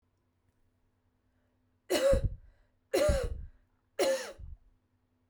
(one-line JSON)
{"three_cough_length": "5.3 s", "three_cough_amplitude": 7719, "three_cough_signal_mean_std_ratio": 0.4, "survey_phase": "beta (2021-08-13 to 2022-03-07)", "age": "45-64", "gender": "Female", "wearing_mask": "No", "symptom_none": true, "smoker_status": "Never smoked", "respiratory_condition_asthma": false, "respiratory_condition_other": false, "recruitment_source": "REACT", "submission_delay": "0 days", "covid_test_result": "Negative", "covid_test_method": "RT-qPCR", "influenza_a_test_result": "Negative", "influenza_b_test_result": "Negative"}